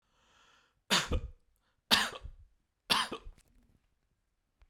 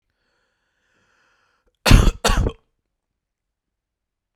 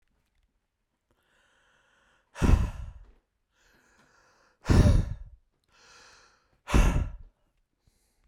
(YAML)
three_cough_length: 4.7 s
three_cough_amplitude: 12635
three_cough_signal_mean_std_ratio: 0.31
cough_length: 4.4 s
cough_amplitude: 32768
cough_signal_mean_std_ratio: 0.25
exhalation_length: 8.3 s
exhalation_amplitude: 13725
exhalation_signal_mean_std_ratio: 0.3
survey_phase: beta (2021-08-13 to 2022-03-07)
age: 18-44
gender: Male
wearing_mask: 'No'
symptom_none: true
symptom_onset: 12 days
smoker_status: Ex-smoker
respiratory_condition_asthma: false
respiratory_condition_other: false
recruitment_source: REACT
submission_delay: 1 day
covid_test_result: Negative
covid_test_method: RT-qPCR